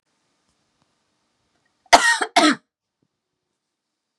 {
  "cough_length": "4.2 s",
  "cough_amplitude": 32768,
  "cough_signal_mean_std_ratio": 0.24,
  "survey_phase": "beta (2021-08-13 to 2022-03-07)",
  "age": "18-44",
  "gender": "Female",
  "wearing_mask": "No",
  "symptom_none": true,
  "smoker_status": "Never smoked",
  "respiratory_condition_asthma": false,
  "respiratory_condition_other": false,
  "recruitment_source": "REACT",
  "submission_delay": "2 days",
  "covid_test_result": "Negative",
  "covid_test_method": "RT-qPCR"
}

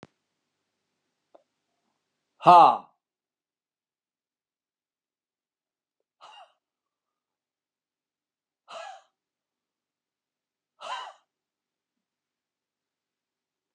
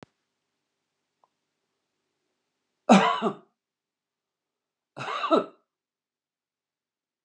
{
  "exhalation_length": "13.7 s",
  "exhalation_amplitude": 26502,
  "exhalation_signal_mean_std_ratio": 0.13,
  "cough_length": "7.2 s",
  "cough_amplitude": 19523,
  "cough_signal_mean_std_ratio": 0.22,
  "survey_phase": "beta (2021-08-13 to 2022-03-07)",
  "age": "65+",
  "gender": "Male",
  "wearing_mask": "No",
  "symptom_none": true,
  "smoker_status": "Ex-smoker",
  "respiratory_condition_asthma": false,
  "respiratory_condition_other": false,
  "recruitment_source": "REACT",
  "submission_delay": "3 days",
  "covid_test_method": "RT-qPCR"
}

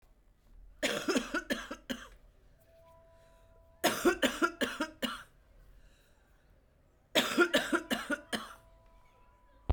{
  "three_cough_length": "9.7 s",
  "three_cough_amplitude": 10818,
  "three_cough_signal_mean_std_ratio": 0.41,
  "survey_phase": "beta (2021-08-13 to 2022-03-07)",
  "age": "45-64",
  "gender": "Female",
  "wearing_mask": "No",
  "symptom_cough_any": true,
  "symptom_onset": "2 days",
  "smoker_status": "Never smoked",
  "respiratory_condition_asthma": false,
  "respiratory_condition_other": false,
  "recruitment_source": "Test and Trace",
  "submission_delay": "1 day",
  "covid_test_result": "Negative",
  "covid_test_method": "RT-qPCR"
}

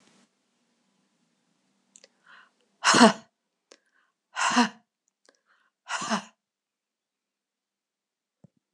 {
  "exhalation_length": "8.7 s",
  "exhalation_amplitude": 24379,
  "exhalation_signal_mean_std_ratio": 0.22,
  "survey_phase": "alpha (2021-03-01 to 2021-08-12)",
  "age": "65+",
  "gender": "Female",
  "wearing_mask": "No",
  "symptom_none": true,
  "smoker_status": "Never smoked",
  "respiratory_condition_asthma": false,
  "respiratory_condition_other": false,
  "recruitment_source": "REACT",
  "submission_delay": "1 day",
  "covid_test_result": "Negative",
  "covid_test_method": "RT-qPCR"
}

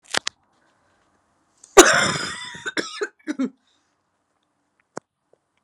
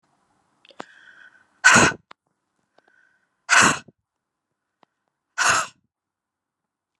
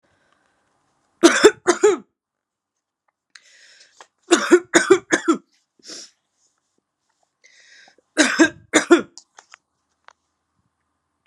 {
  "cough_length": "5.6 s",
  "cough_amplitude": 32768,
  "cough_signal_mean_std_ratio": 0.25,
  "exhalation_length": "7.0 s",
  "exhalation_amplitude": 32045,
  "exhalation_signal_mean_std_ratio": 0.26,
  "three_cough_length": "11.3 s",
  "three_cough_amplitude": 32768,
  "three_cough_signal_mean_std_ratio": 0.28,
  "survey_phase": "beta (2021-08-13 to 2022-03-07)",
  "age": "18-44",
  "gender": "Female",
  "wearing_mask": "No",
  "symptom_cough_any": true,
  "symptom_new_continuous_cough": true,
  "symptom_runny_or_blocked_nose": true,
  "symptom_sore_throat": true,
  "symptom_fatigue": true,
  "symptom_headache": true,
  "symptom_change_to_sense_of_smell_or_taste": true,
  "symptom_loss_of_taste": true,
  "smoker_status": "Never smoked",
  "respiratory_condition_asthma": false,
  "respiratory_condition_other": false,
  "recruitment_source": "Test and Trace",
  "submission_delay": "2 days",
  "covid_test_result": "Positive",
  "covid_test_method": "RT-qPCR",
  "covid_ct_value": 28.4,
  "covid_ct_gene": "ORF1ab gene"
}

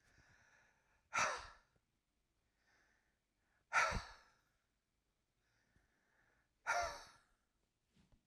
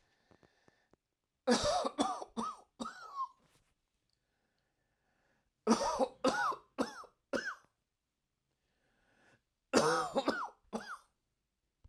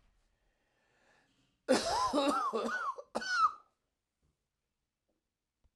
{
  "exhalation_length": "8.3 s",
  "exhalation_amplitude": 2372,
  "exhalation_signal_mean_std_ratio": 0.27,
  "three_cough_length": "11.9 s",
  "three_cough_amplitude": 6467,
  "three_cough_signal_mean_std_ratio": 0.38,
  "cough_length": "5.8 s",
  "cough_amplitude": 6138,
  "cough_signal_mean_std_ratio": 0.43,
  "survey_phase": "alpha (2021-03-01 to 2021-08-12)",
  "age": "45-64",
  "gender": "Male",
  "wearing_mask": "No",
  "symptom_diarrhoea": true,
  "symptom_fatigue": true,
  "symptom_headache": true,
  "smoker_status": "Ex-smoker",
  "respiratory_condition_asthma": false,
  "respiratory_condition_other": false,
  "recruitment_source": "REACT",
  "submission_delay": "2 days",
  "covid_test_result": "Negative",
  "covid_test_method": "RT-qPCR"
}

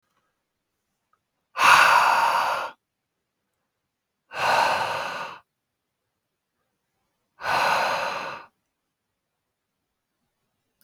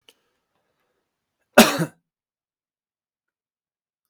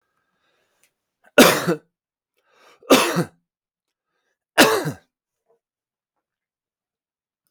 {
  "exhalation_length": "10.8 s",
  "exhalation_amplitude": 25137,
  "exhalation_signal_mean_std_ratio": 0.38,
  "cough_length": "4.1 s",
  "cough_amplitude": 32768,
  "cough_signal_mean_std_ratio": 0.16,
  "three_cough_length": "7.5 s",
  "three_cough_amplitude": 32768,
  "three_cough_signal_mean_std_ratio": 0.25,
  "survey_phase": "beta (2021-08-13 to 2022-03-07)",
  "age": "18-44",
  "gender": "Male",
  "wearing_mask": "No",
  "symptom_cough_any": true,
  "symptom_onset": "12 days",
  "smoker_status": "Never smoked",
  "respiratory_condition_asthma": false,
  "respiratory_condition_other": false,
  "recruitment_source": "REACT",
  "submission_delay": "3 days",
  "covid_test_result": "Negative",
  "covid_test_method": "RT-qPCR",
  "influenza_a_test_result": "Negative",
  "influenza_b_test_result": "Negative"
}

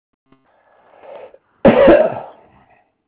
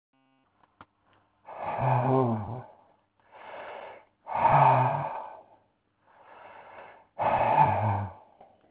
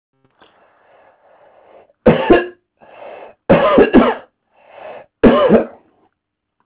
{
  "cough_length": "3.1 s",
  "cough_amplitude": 32312,
  "cough_signal_mean_std_ratio": 0.35,
  "exhalation_length": "8.7 s",
  "exhalation_amplitude": 12136,
  "exhalation_signal_mean_std_ratio": 0.48,
  "three_cough_length": "6.7 s",
  "three_cough_amplitude": 32742,
  "three_cough_signal_mean_std_ratio": 0.38,
  "survey_phase": "alpha (2021-03-01 to 2021-08-12)",
  "age": "65+",
  "gender": "Male",
  "wearing_mask": "No",
  "symptom_none": true,
  "smoker_status": "Ex-smoker",
  "respiratory_condition_asthma": false,
  "respiratory_condition_other": false,
  "recruitment_source": "REACT",
  "submission_delay": "2 days",
  "covid_test_result": "Negative",
  "covid_test_method": "RT-qPCR"
}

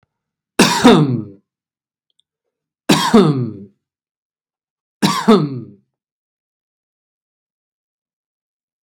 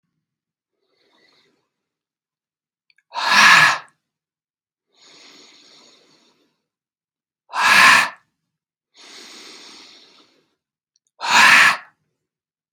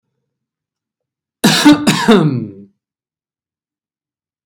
{
  "three_cough_length": "8.8 s",
  "three_cough_amplitude": 32768,
  "three_cough_signal_mean_std_ratio": 0.32,
  "exhalation_length": "12.7 s",
  "exhalation_amplitude": 32768,
  "exhalation_signal_mean_std_ratio": 0.29,
  "cough_length": "4.5 s",
  "cough_amplitude": 32768,
  "cough_signal_mean_std_ratio": 0.36,
  "survey_phase": "beta (2021-08-13 to 2022-03-07)",
  "age": "18-44",
  "gender": "Male",
  "wearing_mask": "No",
  "symptom_none": true,
  "smoker_status": "Never smoked",
  "respiratory_condition_asthma": false,
  "respiratory_condition_other": false,
  "recruitment_source": "REACT",
  "submission_delay": "6 days",
  "covid_test_result": "Negative",
  "covid_test_method": "RT-qPCR",
  "influenza_a_test_result": "Negative",
  "influenza_b_test_result": "Negative"
}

